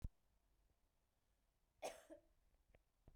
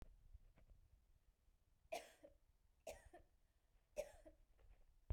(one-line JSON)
{"cough_length": "3.2 s", "cough_amplitude": 630, "cough_signal_mean_std_ratio": 0.28, "three_cough_length": "5.1 s", "three_cough_amplitude": 622, "three_cough_signal_mean_std_ratio": 0.36, "survey_phase": "beta (2021-08-13 to 2022-03-07)", "age": "18-44", "gender": "Female", "wearing_mask": "No", "symptom_none": true, "smoker_status": "Never smoked", "respiratory_condition_asthma": false, "respiratory_condition_other": false, "recruitment_source": "REACT", "submission_delay": "6 days", "covid_test_result": "Negative", "covid_test_method": "RT-qPCR"}